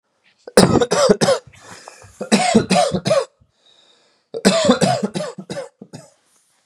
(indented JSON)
{
  "cough_length": "6.7 s",
  "cough_amplitude": 32768,
  "cough_signal_mean_std_ratio": 0.49,
  "survey_phase": "beta (2021-08-13 to 2022-03-07)",
  "age": "18-44",
  "gender": "Male",
  "wearing_mask": "No",
  "symptom_none": true,
  "smoker_status": "Ex-smoker",
  "respiratory_condition_asthma": false,
  "respiratory_condition_other": false,
  "recruitment_source": "REACT",
  "submission_delay": "1 day",
  "covid_test_result": "Negative",
  "covid_test_method": "RT-qPCR",
  "influenza_a_test_result": "Negative",
  "influenza_b_test_result": "Negative"
}